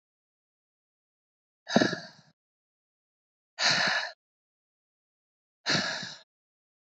{"exhalation_length": "7.0 s", "exhalation_amplitude": 16577, "exhalation_signal_mean_std_ratio": 0.3, "survey_phase": "beta (2021-08-13 to 2022-03-07)", "age": "18-44", "gender": "Female", "wearing_mask": "No", "symptom_none": true, "smoker_status": "Ex-smoker", "respiratory_condition_asthma": false, "respiratory_condition_other": false, "recruitment_source": "REACT", "submission_delay": "0 days", "covid_test_result": "Negative", "covid_test_method": "RT-qPCR", "influenza_a_test_result": "Negative", "influenza_b_test_result": "Negative"}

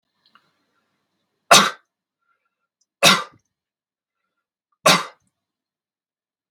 {"three_cough_length": "6.5 s", "three_cough_amplitude": 32768, "three_cough_signal_mean_std_ratio": 0.21, "survey_phase": "beta (2021-08-13 to 2022-03-07)", "age": "45-64", "gender": "Male", "wearing_mask": "No", "symptom_none": true, "smoker_status": "Never smoked", "respiratory_condition_asthma": false, "respiratory_condition_other": false, "recruitment_source": "REACT", "submission_delay": "2 days", "covid_test_result": "Negative", "covid_test_method": "RT-qPCR", "influenza_a_test_result": "Negative", "influenza_b_test_result": "Negative"}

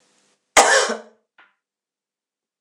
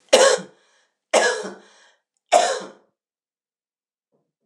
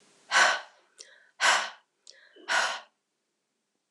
{"cough_length": "2.6 s", "cough_amplitude": 26028, "cough_signal_mean_std_ratio": 0.29, "three_cough_length": "4.5 s", "three_cough_amplitude": 26028, "three_cough_signal_mean_std_ratio": 0.33, "exhalation_length": "3.9 s", "exhalation_amplitude": 12303, "exhalation_signal_mean_std_ratio": 0.37, "survey_phase": "beta (2021-08-13 to 2022-03-07)", "age": "65+", "gender": "Female", "wearing_mask": "No", "symptom_cough_any": true, "symptom_runny_or_blocked_nose": true, "symptom_change_to_sense_of_smell_or_taste": true, "symptom_loss_of_taste": true, "symptom_onset": "5 days", "smoker_status": "Never smoked", "respiratory_condition_asthma": false, "respiratory_condition_other": false, "recruitment_source": "Test and Trace", "submission_delay": "2 days", "covid_test_result": "Positive", "covid_test_method": "RT-qPCR", "covid_ct_value": 16.4, "covid_ct_gene": "ORF1ab gene", "covid_ct_mean": 16.8, "covid_viral_load": "3100000 copies/ml", "covid_viral_load_category": "High viral load (>1M copies/ml)"}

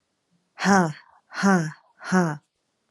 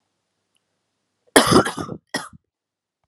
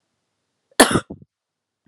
{"exhalation_length": "2.9 s", "exhalation_amplitude": 21392, "exhalation_signal_mean_std_ratio": 0.44, "three_cough_length": "3.1 s", "three_cough_amplitude": 32768, "three_cough_signal_mean_std_ratio": 0.27, "cough_length": "1.9 s", "cough_amplitude": 32768, "cough_signal_mean_std_ratio": 0.22, "survey_phase": "beta (2021-08-13 to 2022-03-07)", "age": "18-44", "gender": "Female", "wearing_mask": "No", "symptom_cough_any": true, "symptom_new_continuous_cough": true, "symptom_sore_throat": true, "symptom_fatigue": true, "symptom_fever_high_temperature": true, "symptom_headache": true, "symptom_onset": "2 days", "smoker_status": "Never smoked", "respiratory_condition_asthma": false, "respiratory_condition_other": false, "recruitment_source": "Test and Trace", "submission_delay": "1 day", "covid_test_result": "Positive", "covid_test_method": "RT-qPCR", "covid_ct_value": 23.4, "covid_ct_gene": "ORF1ab gene", "covid_ct_mean": 23.8, "covid_viral_load": "16000 copies/ml", "covid_viral_load_category": "Low viral load (10K-1M copies/ml)"}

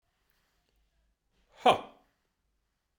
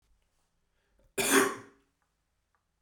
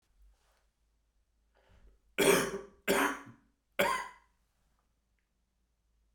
{"exhalation_length": "3.0 s", "exhalation_amplitude": 13389, "exhalation_signal_mean_std_ratio": 0.17, "cough_length": "2.8 s", "cough_amplitude": 10267, "cough_signal_mean_std_ratio": 0.28, "three_cough_length": "6.1 s", "three_cough_amplitude": 7398, "three_cough_signal_mean_std_ratio": 0.31, "survey_phase": "beta (2021-08-13 to 2022-03-07)", "age": "45-64", "gender": "Male", "wearing_mask": "No", "symptom_cough_any": true, "symptom_runny_or_blocked_nose": true, "symptom_fatigue": true, "symptom_headache": true, "smoker_status": "Never smoked", "respiratory_condition_asthma": false, "respiratory_condition_other": false, "recruitment_source": "Test and Trace", "submission_delay": "1 day", "covid_test_result": "Positive", "covid_test_method": "RT-qPCR"}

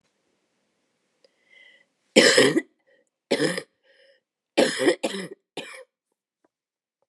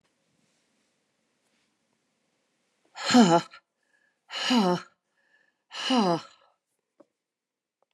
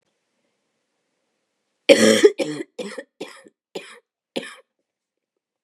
{"three_cough_length": "7.1 s", "three_cough_amplitude": 28752, "three_cough_signal_mean_std_ratio": 0.31, "exhalation_length": "7.9 s", "exhalation_amplitude": 19005, "exhalation_signal_mean_std_ratio": 0.29, "cough_length": "5.6 s", "cough_amplitude": 32768, "cough_signal_mean_std_ratio": 0.25, "survey_phase": "beta (2021-08-13 to 2022-03-07)", "age": "65+", "gender": "Female", "wearing_mask": "No", "symptom_cough_any": true, "symptom_runny_or_blocked_nose": true, "symptom_sore_throat": true, "symptom_headache": true, "symptom_onset": "4 days", "smoker_status": "Never smoked", "respiratory_condition_asthma": false, "respiratory_condition_other": false, "recruitment_source": "Test and Trace", "submission_delay": "1 day", "covid_test_result": "Negative", "covid_test_method": "RT-qPCR"}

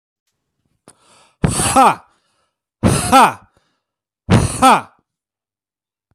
{"exhalation_length": "6.1 s", "exhalation_amplitude": 32768, "exhalation_signal_mean_std_ratio": 0.38, "survey_phase": "beta (2021-08-13 to 2022-03-07)", "age": "18-44", "gender": "Male", "wearing_mask": "No", "symptom_cough_any": true, "symptom_headache": true, "symptom_change_to_sense_of_smell_or_taste": true, "symptom_onset": "5 days", "smoker_status": "Ex-smoker", "respiratory_condition_asthma": false, "respiratory_condition_other": false, "recruitment_source": "Test and Trace", "submission_delay": "2 days", "covid_test_result": "Positive", "covid_test_method": "ePCR"}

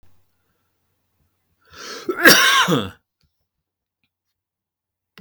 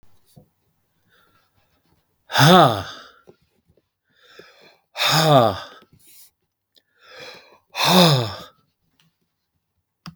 {"cough_length": "5.2 s", "cough_amplitude": 32768, "cough_signal_mean_std_ratio": 0.29, "exhalation_length": "10.2 s", "exhalation_amplitude": 32766, "exhalation_signal_mean_std_ratio": 0.32, "survey_phase": "beta (2021-08-13 to 2022-03-07)", "age": "45-64", "gender": "Male", "wearing_mask": "No", "symptom_none": true, "smoker_status": "Never smoked", "respiratory_condition_asthma": false, "respiratory_condition_other": false, "recruitment_source": "REACT", "submission_delay": "3 days", "covid_test_result": "Negative", "covid_test_method": "RT-qPCR", "influenza_a_test_result": "Negative", "influenza_b_test_result": "Negative"}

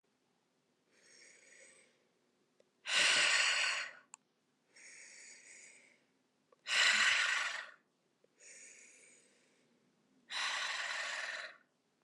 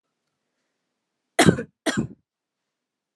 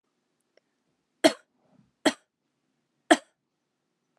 {"exhalation_length": "12.0 s", "exhalation_amplitude": 4035, "exhalation_signal_mean_std_ratio": 0.42, "cough_length": "3.2 s", "cough_amplitude": 30651, "cough_signal_mean_std_ratio": 0.23, "three_cough_length": "4.2 s", "three_cough_amplitude": 23677, "three_cough_signal_mean_std_ratio": 0.15, "survey_phase": "alpha (2021-03-01 to 2021-08-12)", "age": "18-44", "gender": "Female", "wearing_mask": "No", "symptom_fatigue": true, "symptom_headache": true, "symptom_change_to_sense_of_smell_or_taste": true, "symptom_loss_of_taste": true, "smoker_status": "Never smoked", "respiratory_condition_asthma": false, "respiratory_condition_other": false, "recruitment_source": "Test and Trace", "submission_delay": "1 day", "covid_test_result": "Positive", "covid_test_method": "RT-qPCR", "covid_ct_value": 20.3, "covid_ct_gene": "ORF1ab gene"}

